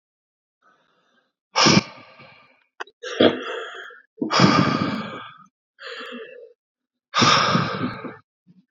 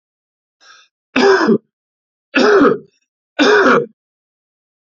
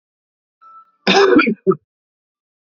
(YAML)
exhalation_length: 8.7 s
exhalation_amplitude: 26725
exhalation_signal_mean_std_ratio: 0.42
three_cough_length: 4.9 s
three_cough_amplitude: 32768
three_cough_signal_mean_std_ratio: 0.45
cough_length: 2.7 s
cough_amplitude: 29442
cough_signal_mean_std_ratio: 0.37
survey_phase: beta (2021-08-13 to 2022-03-07)
age: 18-44
gender: Male
wearing_mask: 'No'
symptom_none: true
smoker_status: Never smoked
respiratory_condition_asthma: false
respiratory_condition_other: false
recruitment_source: Test and Trace
submission_delay: 2 days
covid_test_result: Positive
covid_test_method: ePCR